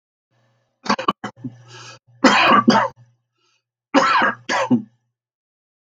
{
  "three_cough_length": "5.8 s",
  "three_cough_amplitude": 32768,
  "three_cough_signal_mean_std_ratio": 0.42,
  "survey_phase": "beta (2021-08-13 to 2022-03-07)",
  "age": "65+",
  "gender": "Male",
  "wearing_mask": "No",
  "symptom_cough_any": true,
  "smoker_status": "Ex-smoker",
  "respiratory_condition_asthma": false,
  "respiratory_condition_other": false,
  "recruitment_source": "REACT",
  "submission_delay": "5 days",
  "covid_test_result": "Negative",
  "covid_test_method": "RT-qPCR",
  "influenza_a_test_result": "Negative",
  "influenza_b_test_result": "Negative"
}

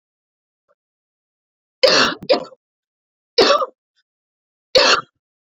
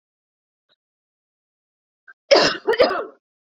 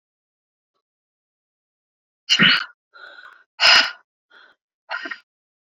{
  "three_cough_length": "5.5 s",
  "three_cough_amplitude": 32767,
  "three_cough_signal_mean_std_ratio": 0.33,
  "cough_length": "3.5 s",
  "cough_amplitude": 28787,
  "cough_signal_mean_std_ratio": 0.3,
  "exhalation_length": "5.6 s",
  "exhalation_amplitude": 30126,
  "exhalation_signal_mean_std_ratio": 0.28,
  "survey_phase": "beta (2021-08-13 to 2022-03-07)",
  "age": "18-44",
  "gender": "Female",
  "wearing_mask": "No",
  "symptom_none": true,
  "smoker_status": "Never smoked",
  "respiratory_condition_asthma": false,
  "respiratory_condition_other": false,
  "recruitment_source": "REACT",
  "submission_delay": "1 day",
  "covid_test_result": "Negative",
  "covid_test_method": "RT-qPCR"
}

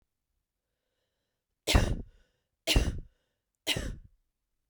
{
  "three_cough_length": "4.7 s",
  "three_cough_amplitude": 10045,
  "three_cough_signal_mean_std_ratio": 0.31,
  "survey_phase": "beta (2021-08-13 to 2022-03-07)",
  "age": "18-44",
  "gender": "Female",
  "wearing_mask": "No",
  "symptom_runny_or_blocked_nose": true,
  "symptom_headache": true,
  "symptom_other": true,
  "smoker_status": "Never smoked",
  "respiratory_condition_asthma": false,
  "respiratory_condition_other": false,
  "recruitment_source": "Test and Trace",
  "submission_delay": "2 days",
  "covid_test_result": "Positive",
  "covid_test_method": "RT-qPCR",
  "covid_ct_value": 22.2,
  "covid_ct_gene": "ORF1ab gene",
  "covid_ct_mean": 22.8,
  "covid_viral_load": "33000 copies/ml",
  "covid_viral_load_category": "Low viral load (10K-1M copies/ml)"
}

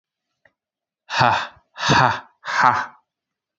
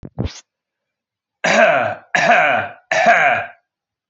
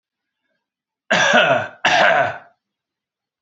{
  "exhalation_length": "3.6 s",
  "exhalation_amplitude": 27277,
  "exhalation_signal_mean_std_ratio": 0.42,
  "three_cough_length": "4.1 s",
  "three_cough_amplitude": 30599,
  "three_cough_signal_mean_std_ratio": 0.55,
  "cough_length": "3.4 s",
  "cough_amplitude": 28812,
  "cough_signal_mean_std_ratio": 0.47,
  "survey_phase": "alpha (2021-03-01 to 2021-08-12)",
  "age": "18-44",
  "gender": "Male",
  "wearing_mask": "No",
  "symptom_new_continuous_cough": true,
  "symptom_headache": true,
  "symptom_onset": "3 days",
  "smoker_status": "Never smoked",
  "respiratory_condition_asthma": false,
  "respiratory_condition_other": false,
  "recruitment_source": "Test and Trace",
  "submission_delay": "2 days",
  "covid_test_result": "Positive",
  "covid_test_method": "RT-qPCR",
  "covid_ct_value": 34.6,
  "covid_ct_gene": "ORF1ab gene",
  "covid_ct_mean": 34.6,
  "covid_viral_load": "4.4 copies/ml",
  "covid_viral_load_category": "Minimal viral load (< 10K copies/ml)"
}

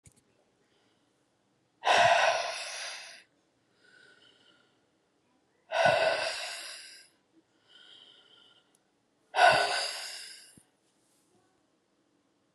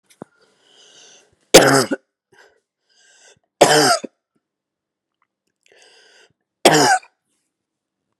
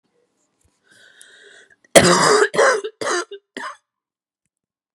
{
  "exhalation_length": "12.5 s",
  "exhalation_amplitude": 11491,
  "exhalation_signal_mean_std_ratio": 0.34,
  "three_cough_length": "8.2 s",
  "three_cough_amplitude": 32768,
  "three_cough_signal_mean_std_ratio": 0.28,
  "cough_length": "4.9 s",
  "cough_amplitude": 32768,
  "cough_signal_mean_std_ratio": 0.36,
  "survey_phase": "beta (2021-08-13 to 2022-03-07)",
  "age": "18-44",
  "gender": "Female",
  "wearing_mask": "No",
  "symptom_cough_any": true,
  "symptom_runny_or_blocked_nose": true,
  "symptom_shortness_of_breath": true,
  "symptom_fatigue": true,
  "symptom_fever_high_temperature": true,
  "symptom_headache": true,
  "symptom_change_to_sense_of_smell_or_taste": true,
  "symptom_loss_of_taste": true,
  "symptom_onset": "4 days",
  "smoker_status": "Ex-smoker",
  "respiratory_condition_asthma": false,
  "respiratory_condition_other": false,
  "recruitment_source": "Test and Trace",
  "submission_delay": "2 days",
  "covid_test_result": "Positive",
  "covid_test_method": "RT-qPCR",
  "covid_ct_value": 15.0,
  "covid_ct_gene": "ORF1ab gene",
  "covid_ct_mean": 15.6,
  "covid_viral_load": "7900000 copies/ml",
  "covid_viral_load_category": "High viral load (>1M copies/ml)"
}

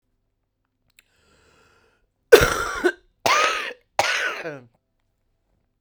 {
  "three_cough_length": "5.8 s",
  "three_cough_amplitude": 32768,
  "three_cough_signal_mean_std_ratio": 0.31,
  "survey_phase": "beta (2021-08-13 to 2022-03-07)",
  "age": "45-64",
  "gender": "Female",
  "wearing_mask": "No",
  "symptom_cough_any": true,
  "symptom_runny_or_blocked_nose": true,
  "symptom_change_to_sense_of_smell_or_taste": true,
  "smoker_status": "Never smoked",
  "respiratory_condition_asthma": true,
  "respiratory_condition_other": false,
  "recruitment_source": "Test and Trace",
  "submission_delay": "2 days",
  "covid_test_result": "Positive",
  "covid_test_method": "RT-qPCR",
  "covid_ct_value": 27.5,
  "covid_ct_gene": "ORF1ab gene",
  "covid_ct_mean": 28.1,
  "covid_viral_load": "590 copies/ml",
  "covid_viral_load_category": "Minimal viral load (< 10K copies/ml)"
}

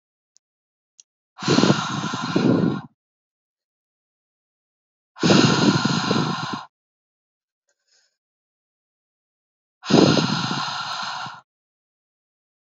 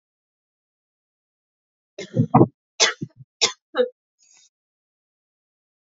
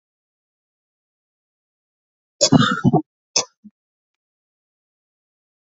{
  "exhalation_length": "12.6 s",
  "exhalation_amplitude": 26645,
  "exhalation_signal_mean_std_ratio": 0.41,
  "three_cough_length": "5.9 s",
  "three_cough_amplitude": 32537,
  "three_cough_signal_mean_std_ratio": 0.23,
  "cough_length": "5.7 s",
  "cough_amplitude": 29165,
  "cough_signal_mean_std_ratio": 0.23,
  "survey_phase": "beta (2021-08-13 to 2022-03-07)",
  "age": "18-44",
  "gender": "Female",
  "wearing_mask": "No",
  "symptom_cough_any": true,
  "symptom_new_continuous_cough": true,
  "symptom_runny_or_blocked_nose": true,
  "symptom_sore_throat": true,
  "symptom_fatigue": true,
  "symptom_headache": true,
  "symptom_change_to_sense_of_smell_or_taste": true,
  "symptom_loss_of_taste": true,
  "symptom_onset": "3 days",
  "smoker_status": "Ex-smoker",
  "respiratory_condition_asthma": false,
  "respiratory_condition_other": false,
  "recruitment_source": "Test and Trace",
  "submission_delay": "2 days",
  "covid_test_result": "Positive",
  "covid_test_method": "RT-qPCR",
  "covid_ct_value": 22.2,
  "covid_ct_gene": "ORF1ab gene",
  "covid_ct_mean": 22.5,
  "covid_viral_load": "41000 copies/ml",
  "covid_viral_load_category": "Low viral load (10K-1M copies/ml)"
}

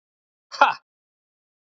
{
  "exhalation_length": "1.6 s",
  "exhalation_amplitude": 27779,
  "exhalation_signal_mean_std_ratio": 0.2,
  "survey_phase": "beta (2021-08-13 to 2022-03-07)",
  "age": "18-44",
  "gender": "Male",
  "wearing_mask": "No",
  "symptom_none": true,
  "smoker_status": "Never smoked",
  "respiratory_condition_asthma": false,
  "respiratory_condition_other": false,
  "recruitment_source": "REACT",
  "submission_delay": "1 day",
  "covid_test_result": "Negative",
  "covid_test_method": "RT-qPCR",
  "influenza_a_test_result": "Unknown/Void",
  "influenza_b_test_result": "Unknown/Void"
}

